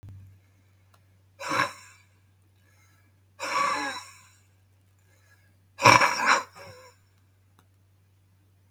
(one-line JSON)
{"exhalation_length": "8.7 s", "exhalation_amplitude": 32405, "exhalation_signal_mean_std_ratio": 0.29, "survey_phase": "beta (2021-08-13 to 2022-03-07)", "age": "65+", "gender": "Male", "wearing_mask": "No", "symptom_cough_any": true, "smoker_status": "Ex-smoker", "respiratory_condition_asthma": false, "respiratory_condition_other": true, "recruitment_source": "REACT", "submission_delay": "1 day", "covid_test_result": "Negative", "covid_test_method": "RT-qPCR", "influenza_a_test_result": "Negative", "influenza_b_test_result": "Negative"}